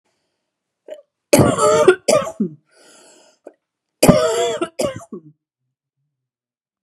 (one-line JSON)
{"cough_length": "6.8 s", "cough_amplitude": 32768, "cough_signal_mean_std_ratio": 0.38, "survey_phase": "beta (2021-08-13 to 2022-03-07)", "age": "45-64", "gender": "Female", "wearing_mask": "No", "symptom_runny_or_blocked_nose": true, "symptom_headache": true, "symptom_change_to_sense_of_smell_or_taste": true, "symptom_loss_of_taste": true, "symptom_onset": "3 days", "smoker_status": "Never smoked", "respiratory_condition_asthma": false, "respiratory_condition_other": false, "recruitment_source": "Test and Trace", "submission_delay": "2 days", "covid_test_result": "Positive", "covid_test_method": "RT-qPCR"}